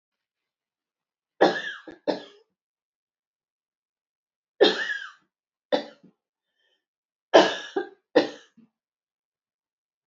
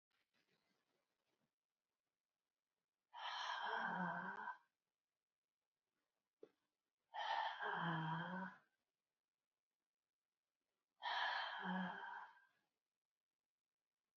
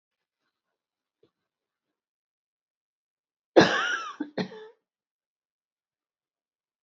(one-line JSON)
{"three_cough_length": "10.1 s", "three_cough_amplitude": 27492, "three_cough_signal_mean_std_ratio": 0.24, "exhalation_length": "14.2 s", "exhalation_amplitude": 864, "exhalation_signal_mean_std_ratio": 0.45, "cough_length": "6.8 s", "cough_amplitude": 27109, "cough_signal_mean_std_ratio": 0.19, "survey_phase": "beta (2021-08-13 to 2022-03-07)", "age": "45-64", "gender": "Female", "wearing_mask": "No", "symptom_cough_any": true, "symptom_new_continuous_cough": true, "symptom_runny_or_blocked_nose": true, "symptom_shortness_of_breath": true, "symptom_sore_throat": true, "symptom_abdominal_pain": true, "symptom_fatigue": true, "symptom_headache": true, "symptom_change_to_sense_of_smell_or_taste": true, "symptom_other": true, "symptom_onset": "2 days", "smoker_status": "Ex-smoker", "respiratory_condition_asthma": false, "respiratory_condition_other": false, "recruitment_source": "Test and Trace", "submission_delay": "1 day", "covid_test_result": "Negative", "covid_test_method": "RT-qPCR"}